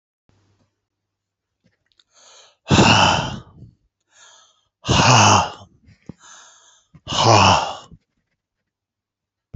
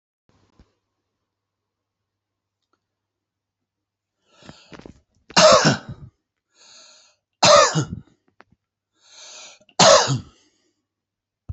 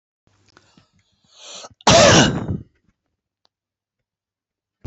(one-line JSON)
{"exhalation_length": "9.6 s", "exhalation_amplitude": 32459, "exhalation_signal_mean_std_ratio": 0.36, "three_cough_length": "11.5 s", "three_cough_amplitude": 31035, "three_cough_signal_mean_std_ratio": 0.26, "cough_length": "4.9 s", "cough_amplitude": 30969, "cough_signal_mean_std_ratio": 0.29, "survey_phase": "beta (2021-08-13 to 2022-03-07)", "age": "65+", "gender": "Male", "wearing_mask": "No", "symptom_none": true, "smoker_status": "Never smoked", "respiratory_condition_asthma": false, "respiratory_condition_other": false, "recruitment_source": "REACT", "submission_delay": "3 days", "covid_test_result": "Negative", "covid_test_method": "RT-qPCR", "influenza_a_test_result": "Negative", "influenza_b_test_result": "Negative"}